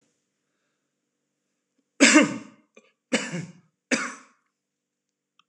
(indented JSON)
{
  "three_cough_length": "5.5 s",
  "three_cough_amplitude": 25247,
  "three_cough_signal_mean_std_ratio": 0.25,
  "survey_phase": "beta (2021-08-13 to 2022-03-07)",
  "age": "45-64",
  "gender": "Male",
  "wearing_mask": "No",
  "symptom_none": true,
  "smoker_status": "Ex-smoker",
  "respiratory_condition_asthma": false,
  "respiratory_condition_other": false,
  "recruitment_source": "REACT",
  "submission_delay": "1 day",
  "covid_test_result": "Negative",
  "covid_test_method": "RT-qPCR"
}